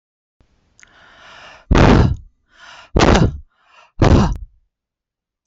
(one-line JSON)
{"exhalation_length": "5.5 s", "exhalation_amplitude": 30245, "exhalation_signal_mean_std_ratio": 0.39, "survey_phase": "alpha (2021-03-01 to 2021-08-12)", "age": "45-64", "gender": "Female", "wearing_mask": "No", "symptom_none": true, "smoker_status": "Ex-smoker", "respiratory_condition_asthma": false, "respiratory_condition_other": false, "recruitment_source": "REACT", "submission_delay": "3 days", "covid_test_result": "Negative", "covid_test_method": "RT-qPCR"}